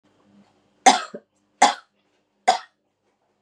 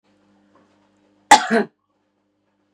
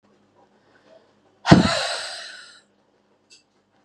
three_cough_length: 3.4 s
three_cough_amplitude: 32219
three_cough_signal_mean_std_ratio: 0.24
cough_length: 2.7 s
cough_amplitude: 32768
cough_signal_mean_std_ratio: 0.21
exhalation_length: 3.8 s
exhalation_amplitude: 32768
exhalation_signal_mean_std_ratio: 0.26
survey_phase: beta (2021-08-13 to 2022-03-07)
age: 18-44
gender: Female
wearing_mask: 'No'
symptom_runny_or_blocked_nose: true
smoker_status: Ex-smoker
respiratory_condition_asthma: false
respiratory_condition_other: false
recruitment_source: REACT
submission_delay: 4 days
covid_test_result: Negative
covid_test_method: RT-qPCR
covid_ct_value: 37.5
covid_ct_gene: N gene
influenza_a_test_result: Negative
influenza_b_test_result: Negative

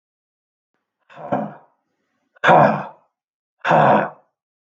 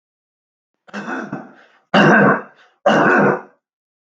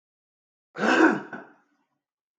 exhalation_length: 4.7 s
exhalation_amplitude: 32768
exhalation_signal_mean_std_ratio: 0.36
three_cough_length: 4.2 s
three_cough_amplitude: 32768
three_cough_signal_mean_std_ratio: 0.45
cough_length: 2.4 s
cough_amplitude: 18174
cough_signal_mean_std_ratio: 0.34
survey_phase: beta (2021-08-13 to 2022-03-07)
age: 45-64
gender: Male
wearing_mask: 'Yes'
symptom_cough_any: true
symptom_runny_or_blocked_nose: true
symptom_headache: true
symptom_onset: 3 days
smoker_status: Never smoked
respiratory_condition_asthma: false
respiratory_condition_other: false
recruitment_source: Test and Trace
submission_delay: 2 days
covid_test_result: Positive
covid_test_method: ePCR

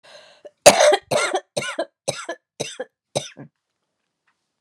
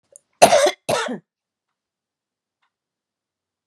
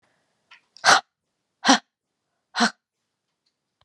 three_cough_length: 4.6 s
three_cough_amplitude: 32768
three_cough_signal_mean_std_ratio: 0.32
cough_length: 3.7 s
cough_amplitude: 32768
cough_signal_mean_std_ratio: 0.27
exhalation_length: 3.8 s
exhalation_amplitude: 27648
exhalation_signal_mean_std_ratio: 0.24
survey_phase: beta (2021-08-13 to 2022-03-07)
age: 45-64
gender: Female
wearing_mask: 'No'
symptom_cough_any: true
symptom_runny_or_blocked_nose: true
symptom_fatigue: true
smoker_status: Current smoker (1 to 10 cigarettes per day)
respiratory_condition_asthma: false
respiratory_condition_other: false
recruitment_source: REACT
submission_delay: 10 days
covid_test_result: Negative
covid_test_method: RT-qPCR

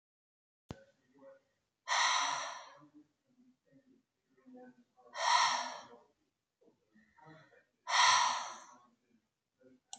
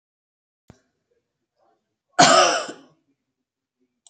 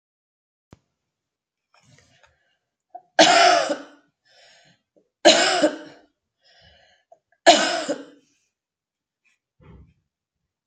exhalation_length: 10.0 s
exhalation_amplitude: 5505
exhalation_signal_mean_std_ratio: 0.35
cough_length: 4.1 s
cough_amplitude: 28482
cough_signal_mean_std_ratio: 0.26
three_cough_length: 10.7 s
three_cough_amplitude: 32768
three_cough_signal_mean_std_ratio: 0.28
survey_phase: beta (2021-08-13 to 2022-03-07)
age: 45-64
gender: Female
wearing_mask: 'No'
symptom_runny_or_blocked_nose: true
symptom_sore_throat: true
symptom_fatigue: true
symptom_change_to_sense_of_smell_or_taste: true
symptom_loss_of_taste: true
symptom_onset: 10 days
smoker_status: Never smoked
respiratory_condition_asthma: false
respiratory_condition_other: false
recruitment_source: Test and Trace
submission_delay: 1 day
covid_test_result: Positive
covid_test_method: RT-qPCR
covid_ct_value: 26.5
covid_ct_gene: N gene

